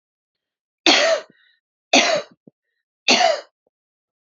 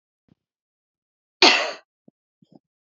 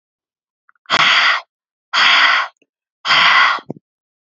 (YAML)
three_cough_length: 4.3 s
three_cough_amplitude: 31079
three_cough_signal_mean_std_ratio: 0.37
cough_length: 2.9 s
cough_amplitude: 29696
cough_signal_mean_std_ratio: 0.22
exhalation_length: 4.3 s
exhalation_amplitude: 32768
exhalation_signal_mean_std_ratio: 0.53
survey_phase: beta (2021-08-13 to 2022-03-07)
age: 18-44
gender: Female
wearing_mask: 'No'
symptom_fatigue: true
symptom_onset: 12 days
smoker_status: Ex-smoker
respiratory_condition_asthma: false
respiratory_condition_other: false
recruitment_source: REACT
submission_delay: 2 days
covid_test_result: Negative
covid_test_method: RT-qPCR